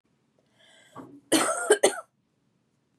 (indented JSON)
{
  "cough_length": "3.0 s",
  "cough_amplitude": 20581,
  "cough_signal_mean_std_ratio": 0.32,
  "survey_phase": "beta (2021-08-13 to 2022-03-07)",
  "age": "18-44",
  "gender": "Female",
  "wearing_mask": "No",
  "symptom_cough_any": true,
  "symptom_sore_throat": true,
  "symptom_onset": "13 days",
  "smoker_status": "Never smoked",
  "respiratory_condition_asthma": false,
  "respiratory_condition_other": false,
  "recruitment_source": "REACT",
  "submission_delay": "4 days",
  "covid_test_result": "Negative",
  "covid_test_method": "RT-qPCR"
}